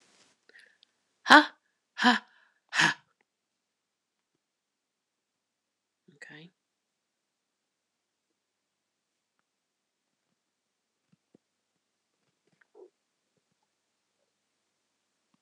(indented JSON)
{
  "exhalation_length": "15.4 s",
  "exhalation_amplitude": 26028,
  "exhalation_signal_mean_std_ratio": 0.12,
  "survey_phase": "alpha (2021-03-01 to 2021-08-12)",
  "age": "45-64",
  "gender": "Female",
  "wearing_mask": "No",
  "symptom_none": true,
  "smoker_status": "Never smoked",
  "respiratory_condition_asthma": false,
  "respiratory_condition_other": false,
  "recruitment_source": "REACT",
  "submission_delay": "2 days",
  "covid_test_result": "Negative",
  "covid_test_method": "RT-qPCR"
}